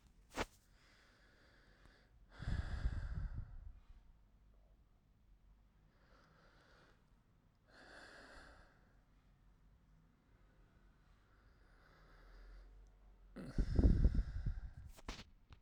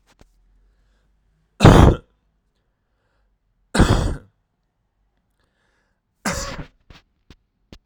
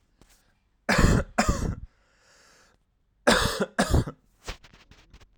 {
  "exhalation_length": "15.6 s",
  "exhalation_amplitude": 3770,
  "exhalation_signal_mean_std_ratio": 0.31,
  "three_cough_length": "7.9 s",
  "three_cough_amplitude": 32768,
  "three_cough_signal_mean_std_ratio": 0.24,
  "cough_length": "5.4 s",
  "cough_amplitude": 19138,
  "cough_signal_mean_std_ratio": 0.4,
  "survey_phase": "alpha (2021-03-01 to 2021-08-12)",
  "age": "18-44",
  "gender": "Male",
  "wearing_mask": "No",
  "symptom_cough_any": true,
  "symptom_shortness_of_breath": true,
  "symptom_headache": true,
  "symptom_onset": "3 days",
  "smoker_status": "Ex-smoker",
  "respiratory_condition_asthma": true,
  "respiratory_condition_other": false,
  "recruitment_source": "Test and Trace",
  "submission_delay": "2 days",
  "covid_test_result": "Positive",
  "covid_test_method": "RT-qPCR",
  "covid_ct_value": 24.6,
  "covid_ct_gene": "ORF1ab gene",
  "covid_ct_mean": 25.7,
  "covid_viral_load": "3800 copies/ml",
  "covid_viral_load_category": "Minimal viral load (< 10K copies/ml)"
}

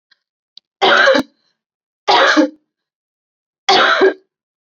{
  "three_cough_length": "4.6 s",
  "three_cough_amplitude": 30788,
  "three_cough_signal_mean_std_ratio": 0.45,
  "survey_phase": "alpha (2021-03-01 to 2021-08-12)",
  "age": "18-44",
  "gender": "Female",
  "wearing_mask": "No",
  "symptom_fatigue": true,
  "symptom_fever_high_temperature": true,
  "symptom_headache": true,
  "smoker_status": "Never smoked",
  "respiratory_condition_asthma": false,
  "respiratory_condition_other": false,
  "recruitment_source": "Test and Trace",
  "submission_delay": "1 day",
  "covid_test_result": "Positive",
  "covid_test_method": "RT-qPCR",
  "covid_ct_value": 14.4,
  "covid_ct_gene": "ORF1ab gene",
  "covid_ct_mean": 14.6,
  "covid_viral_load": "16000000 copies/ml",
  "covid_viral_load_category": "High viral load (>1M copies/ml)"
}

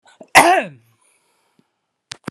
{
  "cough_length": "2.3 s",
  "cough_amplitude": 32768,
  "cough_signal_mean_std_ratio": 0.28,
  "survey_phase": "beta (2021-08-13 to 2022-03-07)",
  "age": "45-64",
  "gender": "Male",
  "wearing_mask": "No",
  "symptom_cough_any": true,
  "symptom_fatigue": true,
  "symptom_fever_high_temperature": true,
  "symptom_headache": true,
  "symptom_change_to_sense_of_smell_or_taste": true,
  "symptom_loss_of_taste": true,
  "symptom_onset": "2 days",
  "smoker_status": "Never smoked",
  "respiratory_condition_asthma": false,
  "respiratory_condition_other": false,
  "recruitment_source": "Test and Trace",
  "submission_delay": "2 days",
  "covid_test_result": "Positive",
  "covid_test_method": "RT-qPCR"
}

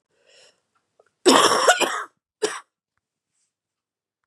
{
  "cough_length": "4.3 s",
  "cough_amplitude": 32748,
  "cough_signal_mean_std_ratio": 0.32,
  "survey_phase": "beta (2021-08-13 to 2022-03-07)",
  "age": "18-44",
  "gender": "Female",
  "wearing_mask": "No",
  "symptom_cough_any": true,
  "symptom_runny_or_blocked_nose": true,
  "symptom_shortness_of_breath": true,
  "symptom_fatigue": true,
  "symptom_headache": true,
  "symptom_onset": "4 days",
  "smoker_status": "Never smoked",
  "respiratory_condition_asthma": false,
  "respiratory_condition_other": false,
  "recruitment_source": "Test and Trace",
  "submission_delay": "2 days",
  "covid_test_result": "Negative",
  "covid_test_method": "RT-qPCR"
}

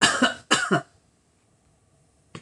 {
  "cough_length": "2.4 s",
  "cough_amplitude": 19691,
  "cough_signal_mean_std_ratio": 0.38,
  "survey_phase": "beta (2021-08-13 to 2022-03-07)",
  "age": "65+",
  "gender": "Female",
  "wearing_mask": "No",
  "symptom_none": true,
  "smoker_status": "Ex-smoker",
  "respiratory_condition_asthma": false,
  "respiratory_condition_other": false,
  "recruitment_source": "REACT",
  "submission_delay": "3 days",
  "covid_test_result": "Negative",
  "covid_test_method": "RT-qPCR"
}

